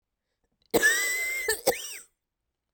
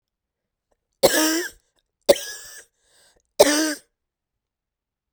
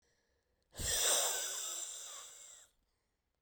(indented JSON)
{
  "cough_length": "2.7 s",
  "cough_amplitude": 11379,
  "cough_signal_mean_std_ratio": 0.49,
  "three_cough_length": "5.1 s",
  "three_cough_amplitude": 32768,
  "three_cough_signal_mean_std_ratio": 0.3,
  "exhalation_length": "3.4 s",
  "exhalation_amplitude": 3295,
  "exhalation_signal_mean_std_ratio": 0.52,
  "survey_phase": "beta (2021-08-13 to 2022-03-07)",
  "age": "18-44",
  "gender": "Female",
  "wearing_mask": "No",
  "symptom_cough_any": true,
  "symptom_shortness_of_breath": true,
  "symptom_abdominal_pain": true,
  "symptom_fatigue": true,
  "symptom_headache": true,
  "symptom_other": true,
  "symptom_onset": "6 days",
  "smoker_status": "Ex-smoker",
  "respiratory_condition_asthma": false,
  "respiratory_condition_other": false,
  "recruitment_source": "Test and Trace",
  "submission_delay": "4 days",
  "covid_test_result": "Positive",
  "covid_test_method": "RT-qPCR",
  "covid_ct_value": 34.7,
  "covid_ct_gene": "ORF1ab gene"
}